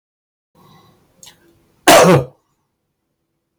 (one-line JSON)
{"cough_length": "3.6 s", "cough_amplitude": 32768, "cough_signal_mean_std_ratio": 0.29, "survey_phase": "beta (2021-08-13 to 2022-03-07)", "age": "65+", "gender": "Male", "wearing_mask": "No", "symptom_cough_any": true, "symptom_shortness_of_breath": true, "symptom_sore_throat": true, "symptom_fatigue": true, "smoker_status": "Ex-smoker", "respiratory_condition_asthma": true, "respiratory_condition_other": false, "recruitment_source": "REACT", "submission_delay": "12 days", "covid_test_result": "Negative", "covid_test_method": "RT-qPCR", "influenza_a_test_result": "Negative", "influenza_b_test_result": "Negative"}